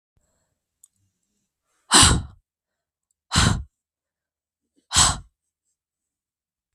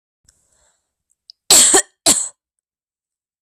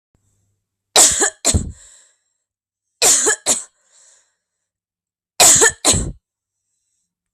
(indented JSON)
{
  "exhalation_length": "6.7 s",
  "exhalation_amplitude": 32768,
  "exhalation_signal_mean_std_ratio": 0.26,
  "cough_length": "3.4 s",
  "cough_amplitude": 32768,
  "cough_signal_mean_std_ratio": 0.3,
  "three_cough_length": "7.3 s",
  "three_cough_amplitude": 32768,
  "three_cough_signal_mean_std_ratio": 0.36,
  "survey_phase": "beta (2021-08-13 to 2022-03-07)",
  "age": "18-44",
  "gender": "Female",
  "wearing_mask": "No",
  "symptom_runny_or_blocked_nose": true,
  "symptom_sore_throat": true,
  "symptom_onset": "3 days",
  "smoker_status": "Never smoked",
  "respiratory_condition_asthma": false,
  "respiratory_condition_other": false,
  "recruitment_source": "Test and Trace",
  "submission_delay": "2 days",
  "covid_test_result": "Positive",
  "covid_test_method": "RT-qPCR",
  "covid_ct_value": 17.1,
  "covid_ct_gene": "N gene",
  "covid_ct_mean": 17.1,
  "covid_viral_load": "2500000 copies/ml",
  "covid_viral_load_category": "High viral load (>1M copies/ml)"
}